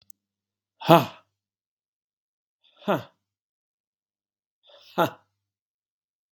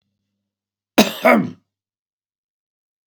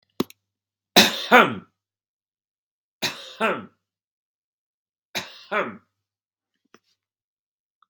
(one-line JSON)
{"exhalation_length": "6.3 s", "exhalation_amplitude": 32767, "exhalation_signal_mean_std_ratio": 0.16, "cough_length": "3.1 s", "cough_amplitude": 32767, "cough_signal_mean_std_ratio": 0.26, "three_cough_length": "7.9 s", "three_cough_amplitude": 32767, "three_cough_signal_mean_std_ratio": 0.23, "survey_phase": "beta (2021-08-13 to 2022-03-07)", "age": "65+", "gender": "Male", "wearing_mask": "No", "symptom_none": true, "smoker_status": "Ex-smoker", "respiratory_condition_asthma": false, "respiratory_condition_other": false, "recruitment_source": "REACT", "submission_delay": "7 days", "covid_test_result": "Negative", "covid_test_method": "RT-qPCR", "influenza_a_test_result": "Negative", "influenza_b_test_result": "Negative"}